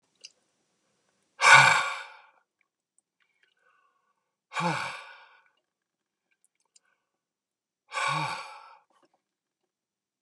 exhalation_length: 10.2 s
exhalation_amplitude: 24235
exhalation_signal_mean_std_ratio: 0.23
survey_phase: beta (2021-08-13 to 2022-03-07)
age: 65+
gender: Male
wearing_mask: 'No'
symptom_none: true
smoker_status: Never smoked
respiratory_condition_asthma: false
respiratory_condition_other: false
recruitment_source: REACT
submission_delay: 3 days
covid_test_result: Negative
covid_test_method: RT-qPCR
influenza_a_test_result: Negative
influenza_b_test_result: Negative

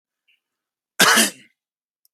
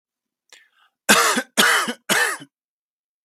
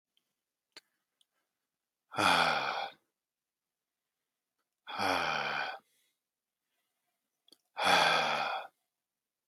cough_length: 2.1 s
cough_amplitude: 32768
cough_signal_mean_std_ratio: 0.3
three_cough_length: 3.2 s
three_cough_amplitude: 32768
three_cough_signal_mean_std_ratio: 0.43
exhalation_length: 9.5 s
exhalation_amplitude: 9087
exhalation_signal_mean_std_ratio: 0.38
survey_phase: beta (2021-08-13 to 2022-03-07)
age: 18-44
gender: Male
wearing_mask: 'No'
symptom_other: true
symptom_onset: 3 days
smoker_status: Never smoked
respiratory_condition_asthma: true
respiratory_condition_other: false
recruitment_source: REACT
submission_delay: 0 days
covid_test_result: Negative
covid_test_method: RT-qPCR
influenza_a_test_result: Negative
influenza_b_test_result: Negative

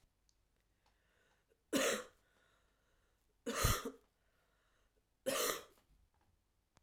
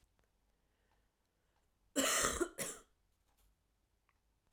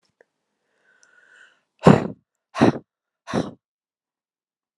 three_cough_length: 6.8 s
three_cough_amplitude: 3749
three_cough_signal_mean_std_ratio: 0.32
cough_length: 4.5 s
cough_amplitude: 3812
cough_signal_mean_std_ratio: 0.3
exhalation_length: 4.8 s
exhalation_amplitude: 32768
exhalation_signal_mean_std_ratio: 0.21
survey_phase: alpha (2021-03-01 to 2021-08-12)
age: 18-44
gender: Female
wearing_mask: 'No'
symptom_cough_any: true
symptom_fatigue: true
symptom_fever_high_temperature: true
symptom_onset: 2 days
smoker_status: Never smoked
respiratory_condition_asthma: false
respiratory_condition_other: false
recruitment_source: Test and Trace
submission_delay: 2 days
covid_test_result: Positive
covid_test_method: RT-qPCR
covid_ct_value: 15.6
covid_ct_gene: ORF1ab gene
covid_ct_mean: 16.0
covid_viral_load: 5600000 copies/ml
covid_viral_load_category: High viral load (>1M copies/ml)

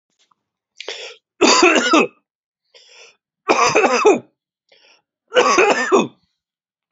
three_cough_length: 6.9 s
three_cough_amplitude: 32453
three_cough_signal_mean_std_ratio: 0.45
survey_phase: beta (2021-08-13 to 2022-03-07)
age: 45-64
gender: Male
wearing_mask: 'No'
symptom_cough_any: true
symptom_runny_or_blocked_nose: true
symptom_fatigue: true
symptom_fever_high_temperature: true
symptom_headache: true
symptom_change_to_sense_of_smell_or_taste: true
symptom_onset: 6 days
smoker_status: Never smoked
respiratory_condition_asthma: false
respiratory_condition_other: false
recruitment_source: Test and Trace
submission_delay: 1 day
covid_test_result: Positive
covid_test_method: RT-qPCR
covid_ct_value: 15.1
covid_ct_gene: ORF1ab gene
covid_ct_mean: 15.4
covid_viral_load: 8900000 copies/ml
covid_viral_load_category: High viral load (>1M copies/ml)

